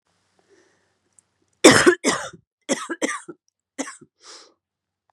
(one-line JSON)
{"three_cough_length": "5.1 s", "three_cough_amplitude": 32768, "three_cough_signal_mean_std_ratio": 0.26, "survey_phase": "beta (2021-08-13 to 2022-03-07)", "age": "45-64", "gender": "Female", "wearing_mask": "No", "symptom_cough_any": true, "symptom_new_continuous_cough": true, "symptom_fatigue": true, "symptom_fever_high_temperature": true, "symptom_headache": true, "symptom_change_to_sense_of_smell_or_taste": true, "symptom_onset": "3 days", "smoker_status": "Never smoked", "respiratory_condition_asthma": false, "respiratory_condition_other": false, "recruitment_source": "Test and Trace", "submission_delay": "1 day", "covid_test_result": "Positive", "covid_test_method": "ePCR"}